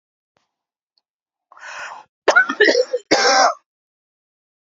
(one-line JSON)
{"cough_length": "4.6 s", "cough_amplitude": 29164, "cough_signal_mean_std_ratio": 0.38, "survey_phase": "alpha (2021-03-01 to 2021-08-12)", "age": "45-64", "gender": "Male", "wearing_mask": "No", "symptom_cough_any": true, "symptom_onset": "7 days", "smoker_status": "Never smoked", "respiratory_condition_asthma": false, "respiratory_condition_other": false, "recruitment_source": "Test and Trace", "submission_delay": "1 day", "covid_test_result": "Positive", "covid_test_method": "RT-qPCR", "covid_ct_value": 35.3, "covid_ct_gene": "ORF1ab gene"}